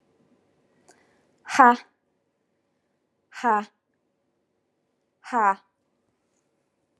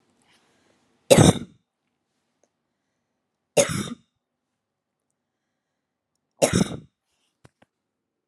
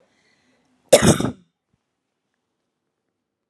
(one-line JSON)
{"exhalation_length": "7.0 s", "exhalation_amplitude": 28215, "exhalation_signal_mean_std_ratio": 0.22, "three_cough_length": "8.3 s", "three_cough_amplitude": 32768, "three_cough_signal_mean_std_ratio": 0.21, "cough_length": "3.5 s", "cough_amplitude": 32767, "cough_signal_mean_std_ratio": 0.21, "survey_phase": "alpha (2021-03-01 to 2021-08-12)", "age": "18-44", "gender": "Female", "wearing_mask": "Yes", "symptom_none": true, "smoker_status": "Never smoked", "respiratory_condition_asthma": true, "respiratory_condition_other": false, "recruitment_source": "Test and Trace", "submission_delay": "0 days", "covid_test_result": "Negative", "covid_test_method": "LFT"}